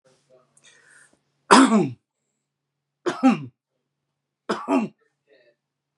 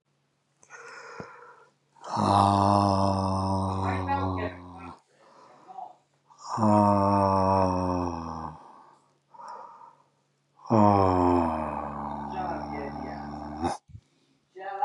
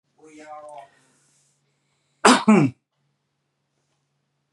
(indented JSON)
{
  "three_cough_length": "6.0 s",
  "three_cough_amplitude": 31908,
  "three_cough_signal_mean_std_ratio": 0.29,
  "exhalation_length": "14.8 s",
  "exhalation_amplitude": 15343,
  "exhalation_signal_mean_std_ratio": 0.56,
  "cough_length": "4.5 s",
  "cough_amplitude": 32767,
  "cough_signal_mean_std_ratio": 0.25,
  "survey_phase": "beta (2021-08-13 to 2022-03-07)",
  "age": "45-64",
  "gender": "Male",
  "wearing_mask": "No",
  "symptom_abdominal_pain": true,
  "symptom_fatigue": true,
  "symptom_headache": true,
  "smoker_status": "Never smoked",
  "respiratory_condition_asthma": false,
  "respiratory_condition_other": false,
  "recruitment_source": "REACT",
  "submission_delay": "5 days",
  "covid_test_result": "Negative",
  "covid_test_method": "RT-qPCR",
  "influenza_a_test_result": "Negative",
  "influenza_b_test_result": "Negative"
}